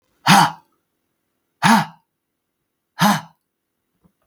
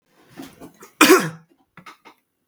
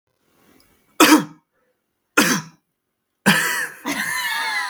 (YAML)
exhalation_length: 4.3 s
exhalation_amplitude: 32768
exhalation_signal_mean_std_ratio: 0.31
cough_length: 2.5 s
cough_amplitude: 32768
cough_signal_mean_std_ratio: 0.28
three_cough_length: 4.7 s
three_cough_amplitude: 32768
three_cough_signal_mean_std_ratio: 0.44
survey_phase: beta (2021-08-13 to 2022-03-07)
age: 18-44
gender: Male
wearing_mask: 'No'
symptom_none: true
symptom_onset: 5 days
smoker_status: Prefer not to say
respiratory_condition_asthma: false
respiratory_condition_other: false
recruitment_source: REACT
submission_delay: 2 days
covid_test_result: Negative
covid_test_method: RT-qPCR
influenza_a_test_result: Negative
influenza_b_test_result: Negative